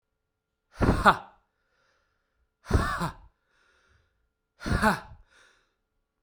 {"exhalation_length": "6.2 s", "exhalation_amplitude": 20253, "exhalation_signal_mean_std_ratio": 0.3, "survey_phase": "alpha (2021-03-01 to 2021-08-12)", "age": "45-64", "gender": "Male", "wearing_mask": "No", "symptom_cough_any": true, "symptom_fatigue": true, "symptom_fever_high_temperature": true, "symptom_headache": true, "symptom_change_to_sense_of_smell_or_taste": true, "symptom_loss_of_taste": true, "smoker_status": "Never smoked", "respiratory_condition_asthma": false, "respiratory_condition_other": false, "recruitment_source": "Test and Trace", "submission_delay": "1 day", "covid_test_result": "Positive", "covid_test_method": "RT-qPCR"}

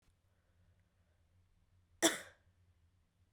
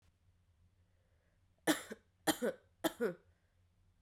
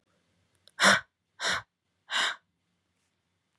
{"cough_length": "3.3 s", "cough_amplitude": 5099, "cough_signal_mean_std_ratio": 0.18, "three_cough_length": "4.0 s", "three_cough_amplitude": 3988, "three_cough_signal_mean_std_ratio": 0.29, "exhalation_length": "3.6 s", "exhalation_amplitude": 15239, "exhalation_signal_mean_std_ratio": 0.3, "survey_phase": "beta (2021-08-13 to 2022-03-07)", "age": "18-44", "gender": "Female", "wearing_mask": "No", "symptom_cough_any": true, "symptom_shortness_of_breath": true, "symptom_sore_throat": true, "symptom_fatigue": true, "symptom_fever_high_temperature": true, "smoker_status": "Current smoker (1 to 10 cigarettes per day)", "respiratory_condition_asthma": false, "respiratory_condition_other": false, "recruitment_source": "Test and Trace", "submission_delay": "1 day", "covid_test_result": "Positive", "covid_test_method": "RT-qPCR", "covid_ct_value": 32.4, "covid_ct_gene": "N gene"}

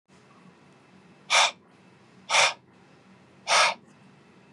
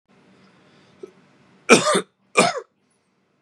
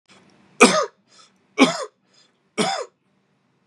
{"exhalation_length": "4.5 s", "exhalation_amplitude": 15510, "exhalation_signal_mean_std_ratio": 0.34, "cough_length": "3.4 s", "cough_amplitude": 32768, "cough_signal_mean_std_ratio": 0.28, "three_cough_length": "3.7 s", "three_cough_amplitude": 32767, "three_cough_signal_mean_std_ratio": 0.3, "survey_phase": "beta (2021-08-13 to 2022-03-07)", "age": "18-44", "gender": "Male", "wearing_mask": "No", "symptom_fatigue": true, "symptom_fever_high_temperature": true, "symptom_headache": true, "symptom_change_to_sense_of_smell_or_taste": true, "symptom_loss_of_taste": true, "smoker_status": "Never smoked", "respiratory_condition_asthma": false, "respiratory_condition_other": false, "recruitment_source": "Test and Trace", "submission_delay": "2 days", "covid_test_result": "Positive", "covid_test_method": "RT-qPCR", "covid_ct_value": 24.9, "covid_ct_gene": "N gene"}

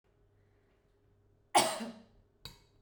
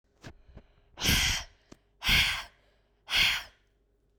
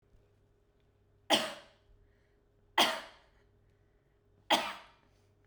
{"cough_length": "2.8 s", "cough_amplitude": 7008, "cough_signal_mean_std_ratio": 0.25, "exhalation_length": "4.2 s", "exhalation_amplitude": 8699, "exhalation_signal_mean_std_ratio": 0.44, "three_cough_length": "5.5 s", "three_cough_amplitude": 8346, "three_cough_signal_mean_std_ratio": 0.27, "survey_phase": "beta (2021-08-13 to 2022-03-07)", "age": "18-44", "gender": "Female", "wearing_mask": "No", "symptom_none": true, "smoker_status": "Ex-smoker", "respiratory_condition_asthma": false, "respiratory_condition_other": false, "recruitment_source": "REACT", "submission_delay": "11 days", "covid_test_result": "Negative", "covid_test_method": "RT-qPCR"}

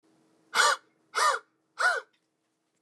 {"exhalation_length": "2.8 s", "exhalation_amplitude": 10124, "exhalation_signal_mean_std_ratio": 0.4, "survey_phase": "beta (2021-08-13 to 2022-03-07)", "age": "45-64", "gender": "Male", "wearing_mask": "No", "symptom_none": true, "smoker_status": "Ex-smoker", "respiratory_condition_asthma": false, "respiratory_condition_other": false, "recruitment_source": "REACT", "submission_delay": "1 day", "covid_test_result": "Negative", "covid_test_method": "RT-qPCR", "influenza_a_test_result": "Negative", "influenza_b_test_result": "Negative"}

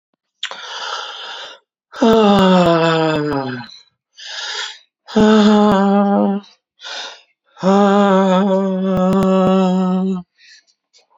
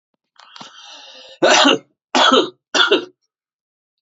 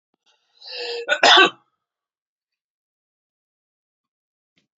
{"exhalation_length": "11.2 s", "exhalation_amplitude": 30809, "exhalation_signal_mean_std_ratio": 0.69, "three_cough_length": "4.0 s", "three_cough_amplitude": 32768, "three_cough_signal_mean_std_ratio": 0.42, "cough_length": "4.8 s", "cough_amplitude": 30062, "cough_signal_mean_std_ratio": 0.24, "survey_phase": "beta (2021-08-13 to 2022-03-07)", "age": "45-64", "gender": "Male", "wearing_mask": "No", "symptom_none": true, "smoker_status": "Prefer not to say", "respiratory_condition_asthma": true, "respiratory_condition_other": false, "recruitment_source": "REACT", "submission_delay": "5 days", "covid_test_result": "Negative", "covid_test_method": "RT-qPCR", "influenza_a_test_result": "Negative", "influenza_b_test_result": "Negative"}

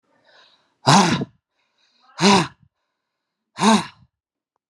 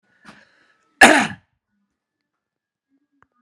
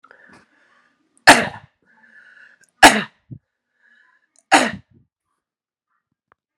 {"exhalation_length": "4.7 s", "exhalation_amplitude": 31098, "exhalation_signal_mean_std_ratio": 0.34, "cough_length": "3.4 s", "cough_amplitude": 32768, "cough_signal_mean_std_ratio": 0.21, "three_cough_length": "6.6 s", "three_cough_amplitude": 32768, "three_cough_signal_mean_std_ratio": 0.21, "survey_phase": "beta (2021-08-13 to 2022-03-07)", "age": "45-64", "gender": "Male", "wearing_mask": "No", "symptom_none": true, "smoker_status": "Current smoker (1 to 10 cigarettes per day)", "respiratory_condition_asthma": false, "respiratory_condition_other": false, "recruitment_source": "Test and Trace", "submission_delay": "2 days", "covid_test_result": "Positive", "covid_test_method": "RT-qPCR"}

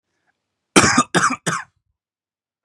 {"cough_length": "2.6 s", "cough_amplitude": 32768, "cough_signal_mean_std_ratio": 0.35, "survey_phase": "beta (2021-08-13 to 2022-03-07)", "age": "18-44", "gender": "Male", "wearing_mask": "No", "symptom_none": true, "smoker_status": "Never smoked", "respiratory_condition_asthma": false, "respiratory_condition_other": false, "recruitment_source": "REACT", "submission_delay": "2 days", "covid_test_result": "Negative", "covid_test_method": "RT-qPCR", "covid_ct_value": 37.0, "covid_ct_gene": "N gene", "influenza_a_test_result": "Negative", "influenza_b_test_result": "Negative"}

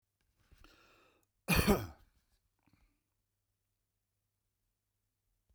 {"three_cough_length": "5.5 s", "three_cough_amplitude": 5339, "three_cough_signal_mean_std_ratio": 0.2, "survey_phase": "beta (2021-08-13 to 2022-03-07)", "age": "65+", "gender": "Male", "wearing_mask": "No", "symptom_none": true, "smoker_status": "Never smoked", "respiratory_condition_asthma": false, "respiratory_condition_other": false, "recruitment_source": "REACT", "submission_delay": "3 days", "covid_test_result": "Negative", "covid_test_method": "RT-qPCR", "influenza_a_test_result": "Negative", "influenza_b_test_result": "Negative"}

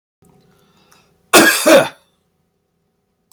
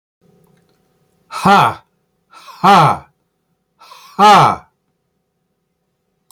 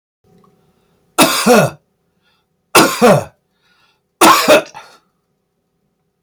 {"cough_length": "3.3 s", "cough_amplitude": 32768, "cough_signal_mean_std_ratio": 0.32, "exhalation_length": "6.3 s", "exhalation_amplitude": 32550, "exhalation_signal_mean_std_ratio": 0.34, "three_cough_length": "6.2 s", "three_cough_amplitude": 32768, "three_cough_signal_mean_std_ratio": 0.38, "survey_phase": "beta (2021-08-13 to 2022-03-07)", "age": "65+", "gender": "Male", "wearing_mask": "No", "symptom_none": true, "smoker_status": "Ex-smoker", "respiratory_condition_asthma": false, "respiratory_condition_other": false, "recruitment_source": "REACT", "submission_delay": "1 day", "covid_test_result": "Negative", "covid_test_method": "RT-qPCR", "influenza_a_test_result": "Negative", "influenza_b_test_result": "Negative"}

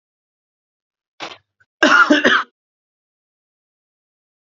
{"cough_length": "4.4 s", "cough_amplitude": 31858, "cough_signal_mean_std_ratio": 0.29, "survey_phase": "beta (2021-08-13 to 2022-03-07)", "age": "18-44", "gender": "Male", "wearing_mask": "No", "symptom_sore_throat": true, "symptom_diarrhoea": true, "smoker_status": "Never smoked", "respiratory_condition_asthma": false, "respiratory_condition_other": false, "recruitment_source": "REACT", "submission_delay": "0 days", "covid_test_result": "Negative", "covid_test_method": "RT-qPCR", "influenza_a_test_result": "Negative", "influenza_b_test_result": "Negative"}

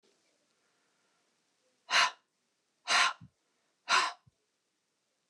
{"exhalation_length": "5.3 s", "exhalation_amplitude": 9293, "exhalation_signal_mean_std_ratio": 0.28, "survey_phase": "beta (2021-08-13 to 2022-03-07)", "age": "45-64", "gender": "Female", "wearing_mask": "No", "symptom_runny_or_blocked_nose": true, "symptom_sore_throat": true, "symptom_onset": "13 days", "smoker_status": "Ex-smoker", "respiratory_condition_asthma": false, "respiratory_condition_other": false, "recruitment_source": "REACT", "submission_delay": "1 day", "covid_test_result": "Negative", "covid_test_method": "RT-qPCR"}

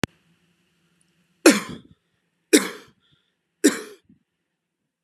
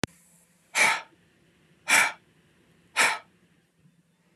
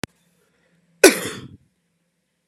{"three_cough_length": "5.0 s", "three_cough_amplitude": 32767, "three_cough_signal_mean_std_ratio": 0.21, "exhalation_length": "4.4 s", "exhalation_amplitude": 17899, "exhalation_signal_mean_std_ratio": 0.32, "cough_length": "2.5 s", "cough_amplitude": 32768, "cough_signal_mean_std_ratio": 0.19, "survey_phase": "beta (2021-08-13 to 2022-03-07)", "age": "18-44", "gender": "Male", "wearing_mask": "No", "symptom_sore_throat": true, "symptom_onset": "8 days", "smoker_status": "Ex-smoker", "respiratory_condition_asthma": false, "respiratory_condition_other": false, "recruitment_source": "REACT", "submission_delay": "1 day", "covid_test_result": "Negative", "covid_test_method": "RT-qPCR"}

